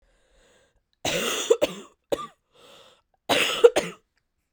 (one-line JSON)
{"three_cough_length": "4.5 s", "three_cough_amplitude": 26616, "three_cough_signal_mean_std_ratio": 0.33, "survey_phase": "beta (2021-08-13 to 2022-03-07)", "age": "18-44", "gender": "Female", "wearing_mask": "No", "symptom_cough_any": true, "symptom_runny_or_blocked_nose": true, "symptom_sore_throat": true, "symptom_fatigue": true, "symptom_headache": true, "symptom_change_to_sense_of_smell_or_taste": true, "symptom_loss_of_taste": true, "symptom_onset": "3 days", "smoker_status": "Never smoked", "respiratory_condition_asthma": false, "respiratory_condition_other": false, "recruitment_source": "Test and Trace", "submission_delay": "2 days", "covid_test_result": "Positive", "covid_test_method": "RT-qPCR", "covid_ct_value": 18.8, "covid_ct_gene": "ORF1ab gene"}